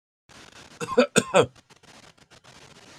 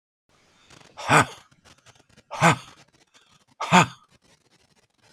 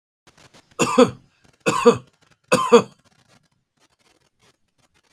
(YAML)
cough_length: 3.0 s
cough_amplitude: 23523
cough_signal_mean_std_ratio: 0.29
exhalation_length: 5.1 s
exhalation_amplitude: 29011
exhalation_signal_mean_std_ratio: 0.27
three_cough_length: 5.1 s
three_cough_amplitude: 32768
three_cough_signal_mean_std_ratio: 0.28
survey_phase: beta (2021-08-13 to 2022-03-07)
age: 65+
gender: Male
wearing_mask: 'No'
symptom_none: true
smoker_status: Ex-smoker
respiratory_condition_asthma: false
respiratory_condition_other: false
recruitment_source: REACT
submission_delay: 4 days
covid_test_result: Negative
covid_test_method: RT-qPCR
influenza_a_test_result: Negative
influenza_b_test_result: Negative